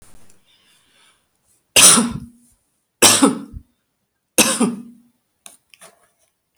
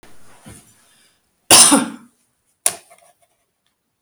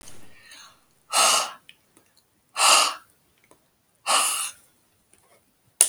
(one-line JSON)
{"three_cough_length": "6.6 s", "three_cough_amplitude": 32768, "three_cough_signal_mean_std_ratio": 0.31, "cough_length": "4.0 s", "cough_amplitude": 32768, "cough_signal_mean_std_ratio": 0.26, "exhalation_length": "5.9 s", "exhalation_amplitude": 32768, "exhalation_signal_mean_std_ratio": 0.36, "survey_phase": "beta (2021-08-13 to 2022-03-07)", "age": "65+", "gender": "Female", "wearing_mask": "No", "symptom_none": true, "smoker_status": "Never smoked", "respiratory_condition_asthma": false, "respiratory_condition_other": false, "recruitment_source": "REACT", "submission_delay": "2 days", "covid_test_result": "Negative", "covid_test_method": "RT-qPCR"}